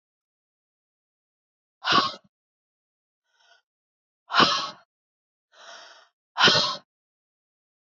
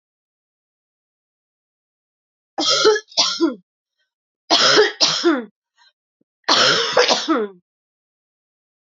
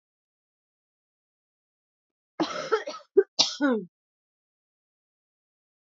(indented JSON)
{
  "exhalation_length": "7.9 s",
  "exhalation_amplitude": 20421,
  "exhalation_signal_mean_std_ratio": 0.27,
  "three_cough_length": "8.9 s",
  "three_cough_amplitude": 30974,
  "three_cough_signal_mean_std_ratio": 0.43,
  "cough_length": "5.8 s",
  "cough_amplitude": 19073,
  "cough_signal_mean_std_ratio": 0.26,
  "survey_phase": "alpha (2021-03-01 to 2021-08-12)",
  "age": "45-64",
  "gender": "Female",
  "wearing_mask": "No",
  "symptom_cough_any": true,
  "symptom_fatigue": true,
  "symptom_headache": true,
  "smoker_status": "Never smoked",
  "respiratory_condition_asthma": false,
  "respiratory_condition_other": false,
  "recruitment_source": "Test and Trace",
  "submission_delay": "2 days",
  "covid_test_result": "Positive",
  "covid_test_method": "RT-qPCR",
  "covid_ct_value": 16.2,
  "covid_ct_gene": "ORF1ab gene",
  "covid_ct_mean": 16.7,
  "covid_viral_load": "3400000 copies/ml",
  "covid_viral_load_category": "High viral load (>1M copies/ml)"
}